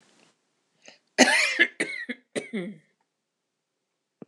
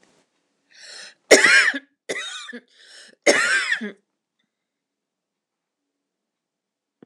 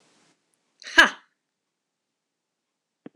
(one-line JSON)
{"cough_length": "4.3 s", "cough_amplitude": 26028, "cough_signal_mean_std_ratio": 0.32, "three_cough_length": "7.1 s", "three_cough_amplitude": 26028, "three_cough_signal_mean_std_ratio": 0.31, "exhalation_length": "3.2 s", "exhalation_amplitude": 26027, "exhalation_signal_mean_std_ratio": 0.15, "survey_phase": "beta (2021-08-13 to 2022-03-07)", "age": "45-64", "gender": "Female", "wearing_mask": "No", "symptom_runny_or_blocked_nose": true, "symptom_onset": "13 days", "smoker_status": "Never smoked", "respiratory_condition_asthma": false, "respiratory_condition_other": false, "recruitment_source": "REACT", "submission_delay": "2 days", "covid_test_result": "Negative", "covid_test_method": "RT-qPCR", "influenza_a_test_result": "Negative", "influenza_b_test_result": "Negative"}